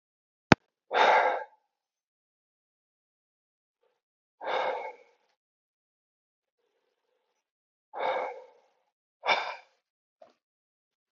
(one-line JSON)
{"exhalation_length": "11.2 s", "exhalation_amplitude": 28026, "exhalation_signal_mean_std_ratio": 0.25, "survey_phase": "beta (2021-08-13 to 2022-03-07)", "age": "18-44", "gender": "Male", "wearing_mask": "No", "symptom_sore_throat": true, "symptom_onset": "2 days", "smoker_status": "Never smoked", "respiratory_condition_asthma": false, "respiratory_condition_other": false, "recruitment_source": "REACT", "submission_delay": "1 day", "covid_test_result": "Negative", "covid_test_method": "RT-qPCR"}